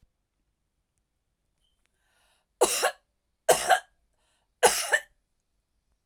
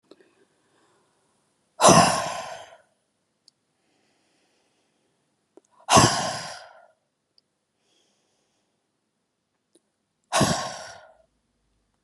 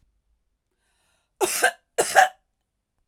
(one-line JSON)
{"three_cough_length": "6.1 s", "three_cough_amplitude": 19391, "three_cough_signal_mean_std_ratio": 0.27, "exhalation_length": "12.0 s", "exhalation_amplitude": 27638, "exhalation_signal_mean_std_ratio": 0.25, "cough_length": "3.1 s", "cough_amplitude": 26943, "cough_signal_mean_std_ratio": 0.29, "survey_phase": "alpha (2021-03-01 to 2021-08-12)", "age": "45-64", "gender": "Female", "wearing_mask": "No", "symptom_fatigue": true, "symptom_headache": true, "symptom_onset": "8 days", "smoker_status": "Never smoked", "respiratory_condition_asthma": false, "respiratory_condition_other": false, "recruitment_source": "REACT", "submission_delay": "1 day", "covid_test_result": "Negative", "covid_test_method": "RT-qPCR"}